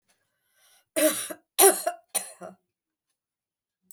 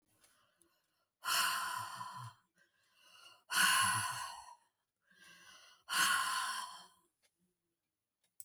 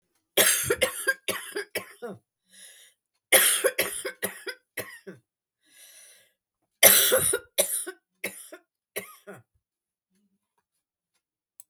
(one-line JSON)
{"cough_length": "3.9 s", "cough_amplitude": 22992, "cough_signal_mean_std_ratio": 0.28, "exhalation_length": "8.4 s", "exhalation_amplitude": 4107, "exhalation_signal_mean_std_ratio": 0.44, "three_cough_length": "11.7 s", "three_cough_amplitude": 32766, "three_cough_signal_mean_std_ratio": 0.34, "survey_phase": "beta (2021-08-13 to 2022-03-07)", "age": "65+", "gender": "Female", "wearing_mask": "No", "symptom_cough_any": true, "smoker_status": "Never smoked", "respiratory_condition_asthma": false, "respiratory_condition_other": false, "recruitment_source": "REACT", "submission_delay": "4 days", "covid_test_result": "Negative", "covid_test_method": "RT-qPCR", "influenza_a_test_result": "Negative", "influenza_b_test_result": "Negative"}